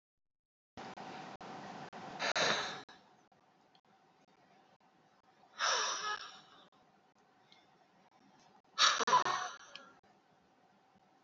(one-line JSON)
{"exhalation_length": "11.2 s", "exhalation_amplitude": 5818, "exhalation_signal_mean_std_ratio": 0.36, "survey_phase": "alpha (2021-03-01 to 2021-08-12)", "age": "45-64", "gender": "Female", "wearing_mask": "No", "symptom_none": true, "symptom_onset": "12 days", "smoker_status": "Current smoker (11 or more cigarettes per day)", "respiratory_condition_asthma": false, "respiratory_condition_other": false, "recruitment_source": "REACT", "submission_delay": "1 day", "covid_test_result": "Negative", "covid_test_method": "RT-qPCR"}